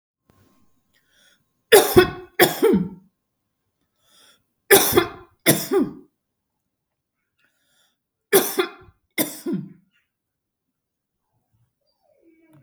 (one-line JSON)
{"three_cough_length": "12.6 s", "three_cough_amplitude": 32768, "three_cough_signal_mean_std_ratio": 0.29, "survey_phase": "beta (2021-08-13 to 2022-03-07)", "age": "45-64", "gender": "Female", "wearing_mask": "No", "symptom_none": true, "smoker_status": "Never smoked", "respiratory_condition_asthma": false, "respiratory_condition_other": false, "recruitment_source": "REACT", "submission_delay": "3 days", "covid_test_result": "Negative", "covid_test_method": "RT-qPCR", "influenza_a_test_result": "Negative", "influenza_b_test_result": "Negative"}